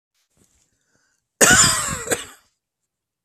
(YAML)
cough_length: 3.2 s
cough_amplitude: 32768
cough_signal_mean_std_ratio: 0.34
survey_phase: beta (2021-08-13 to 2022-03-07)
age: 18-44
gender: Male
wearing_mask: 'No'
symptom_cough_any: true
symptom_runny_or_blocked_nose: true
symptom_sore_throat: true
symptom_onset: 8 days
smoker_status: Never smoked
respiratory_condition_asthma: false
respiratory_condition_other: false
recruitment_source: REACT
submission_delay: 3 days
covid_test_result: Negative
covid_test_method: RT-qPCR
influenza_a_test_result: Negative
influenza_b_test_result: Negative